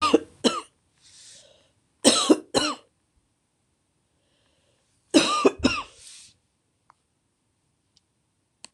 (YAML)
three_cough_length: 8.7 s
three_cough_amplitude: 26027
three_cough_signal_mean_std_ratio: 0.29
survey_phase: beta (2021-08-13 to 2022-03-07)
age: 45-64
gender: Female
wearing_mask: 'No'
symptom_cough_any: true
symptom_runny_or_blocked_nose: true
symptom_shortness_of_breath: true
symptom_fatigue: true
symptom_headache: true
symptom_change_to_sense_of_smell_or_taste: true
symptom_onset: 2 days
smoker_status: Ex-smoker
respiratory_condition_asthma: true
respiratory_condition_other: false
recruitment_source: Test and Trace
submission_delay: 1 day
covid_test_result: Positive
covid_test_method: RT-qPCR
covid_ct_value: 18.9
covid_ct_gene: N gene